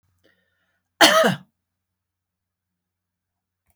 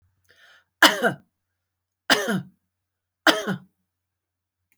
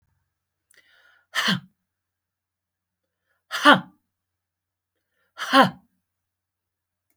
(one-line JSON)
{"cough_length": "3.8 s", "cough_amplitude": 28903, "cough_signal_mean_std_ratio": 0.23, "three_cough_length": "4.8 s", "three_cough_amplitude": 27803, "three_cough_signal_mean_std_ratio": 0.28, "exhalation_length": "7.2 s", "exhalation_amplitude": 27051, "exhalation_signal_mean_std_ratio": 0.21, "survey_phase": "beta (2021-08-13 to 2022-03-07)", "age": "65+", "gender": "Female", "wearing_mask": "No", "symptom_none": true, "smoker_status": "Ex-smoker", "respiratory_condition_asthma": false, "respiratory_condition_other": false, "recruitment_source": "REACT", "submission_delay": "1 day", "covid_test_result": "Negative", "covid_test_method": "RT-qPCR"}